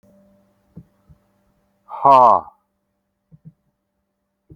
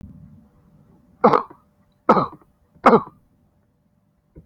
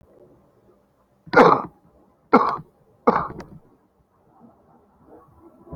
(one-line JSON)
{"exhalation_length": "4.6 s", "exhalation_amplitude": 32768, "exhalation_signal_mean_std_ratio": 0.23, "three_cough_length": "4.5 s", "three_cough_amplitude": 32767, "three_cough_signal_mean_std_ratio": 0.26, "cough_length": "5.8 s", "cough_amplitude": 29168, "cough_signal_mean_std_ratio": 0.26, "survey_phase": "alpha (2021-03-01 to 2021-08-12)", "age": "65+", "gender": "Male", "wearing_mask": "No", "symptom_none": true, "smoker_status": "Current smoker (11 or more cigarettes per day)", "respiratory_condition_asthma": false, "respiratory_condition_other": false, "recruitment_source": "REACT", "submission_delay": "20 days", "covid_test_result": "Negative", "covid_test_method": "RT-qPCR"}